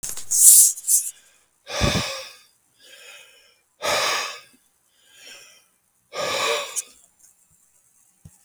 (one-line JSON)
{"exhalation_length": "8.4 s", "exhalation_amplitude": 32768, "exhalation_signal_mean_std_ratio": 0.37, "survey_phase": "beta (2021-08-13 to 2022-03-07)", "age": "45-64", "gender": "Male", "wearing_mask": "No", "symptom_none": true, "smoker_status": "Never smoked", "respiratory_condition_asthma": false, "respiratory_condition_other": false, "recruitment_source": "REACT", "submission_delay": "2 days", "covid_test_result": "Negative", "covid_test_method": "RT-qPCR"}